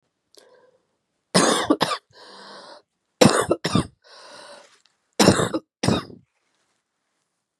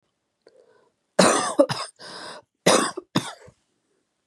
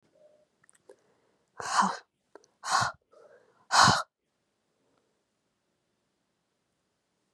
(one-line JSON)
{"three_cough_length": "7.6 s", "three_cough_amplitude": 32767, "three_cough_signal_mean_std_ratio": 0.34, "cough_length": "4.3 s", "cough_amplitude": 29343, "cough_signal_mean_std_ratio": 0.35, "exhalation_length": "7.3 s", "exhalation_amplitude": 12707, "exhalation_signal_mean_std_ratio": 0.25, "survey_phase": "beta (2021-08-13 to 2022-03-07)", "age": "18-44", "gender": "Female", "wearing_mask": "No", "symptom_cough_any": true, "symptom_new_continuous_cough": true, "symptom_runny_or_blocked_nose": true, "symptom_sore_throat": true, "symptom_fatigue": true, "symptom_fever_high_temperature": true, "symptom_headache": true, "symptom_onset": "4 days", "smoker_status": "Never smoked", "respiratory_condition_asthma": false, "respiratory_condition_other": false, "recruitment_source": "Test and Trace", "submission_delay": "2 days", "covid_test_result": "Negative", "covid_test_method": "RT-qPCR"}